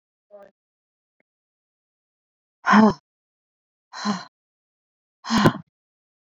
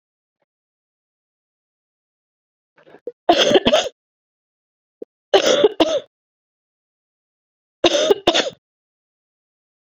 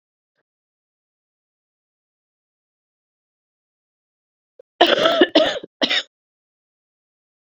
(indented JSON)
{
  "exhalation_length": "6.2 s",
  "exhalation_amplitude": 24365,
  "exhalation_signal_mean_std_ratio": 0.25,
  "three_cough_length": "10.0 s",
  "three_cough_amplitude": 29139,
  "three_cough_signal_mean_std_ratio": 0.3,
  "cough_length": "7.5 s",
  "cough_amplitude": 29871,
  "cough_signal_mean_std_ratio": 0.25,
  "survey_phase": "beta (2021-08-13 to 2022-03-07)",
  "age": "18-44",
  "gender": "Female",
  "wearing_mask": "No",
  "symptom_cough_any": true,
  "symptom_new_continuous_cough": true,
  "symptom_runny_or_blocked_nose": true,
  "symptom_shortness_of_breath": true,
  "symptom_sore_throat": true,
  "symptom_diarrhoea": true,
  "symptom_fatigue": true,
  "symptom_fever_high_temperature": true,
  "symptom_headache": true,
  "symptom_change_to_sense_of_smell_or_taste": true,
  "symptom_loss_of_taste": true,
  "symptom_onset": "3 days",
  "smoker_status": "Never smoked",
  "respiratory_condition_asthma": false,
  "respiratory_condition_other": false,
  "recruitment_source": "Test and Trace",
  "submission_delay": "2 days",
  "covid_test_result": "Positive",
  "covid_test_method": "RT-qPCR",
  "covid_ct_value": 15.8,
  "covid_ct_gene": "ORF1ab gene",
  "covid_ct_mean": 16.3,
  "covid_viral_load": "4700000 copies/ml",
  "covid_viral_load_category": "High viral load (>1M copies/ml)"
}